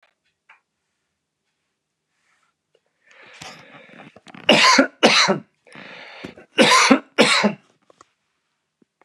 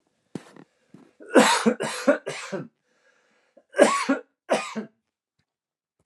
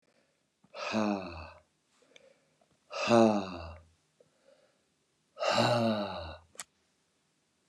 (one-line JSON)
{"three_cough_length": "9.0 s", "three_cough_amplitude": 32768, "three_cough_signal_mean_std_ratio": 0.33, "cough_length": "6.1 s", "cough_amplitude": 26771, "cough_signal_mean_std_ratio": 0.35, "exhalation_length": "7.7 s", "exhalation_amplitude": 10130, "exhalation_signal_mean_std_ratio": 0.38, "survey_phase": "beta (2021-08-13 to 2022-03-07)", "age": "45-64", "gender": "Male", "wearing_mask": "No", "symptom_none": true, "smoker_status": "Never smoked", "respiratory_condition_asthma": false, "respiratory_condition_other": false, "recruitment_source": "REACT", "submission_delay": "2 days", "covid_test_result": "Negative", "covid_test_method": "RT-qPCR", "influenza_a_test_result": "Negative", "influenza_b_test_result": "Negative"}